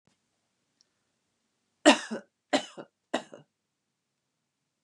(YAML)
three_cough_length: 4.8 s
three_cough_amplitude: 21110
three_cough_signal_mean_std_ratio: 0.18
survey_phase: beta (2021-08-13 to 2022-03-07)
age: 65+
gender: Female
wearing_mask: 'No'
symptom_none: true
smoker_status: Never smoked
respiratory_condition_asthma: false
respiratory_condition_other: false
recruitment_source: REACT
submission_delay: 1 day
covid_test_result: Negative
covid_test_method: RT-qPCR